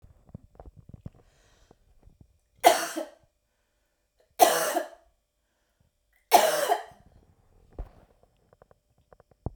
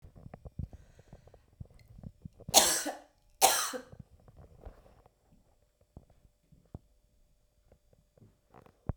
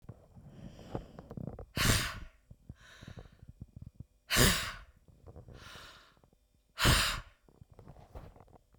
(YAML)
three_cough_length: 9.6 s
three_cough_amplitude: 24574
three_cough_signal_mean_std_ratio: 0.26
cough_length: 9.0 s
cough_amplitude: 18256
cough_signal_mean_std_ratio: 0.24
exhalation_length: 8.8 s
exhalation_amplitude: 10668
exhalation_signal_mean_std_ratio: 0.36
survey_phase: beta (2021-08-13 to 2022-03-07)
age: 45-64
gender: Female
wearing_mask: 'No'
symptom_none: true
smoker_status: Never smoked
respiratory_condition_asthma: false
respiratory_condition_other: false
recruitment_source: REACT
submission_delay: 2 days
covid_test_result: Negative
covid_test_method: RT-qPCR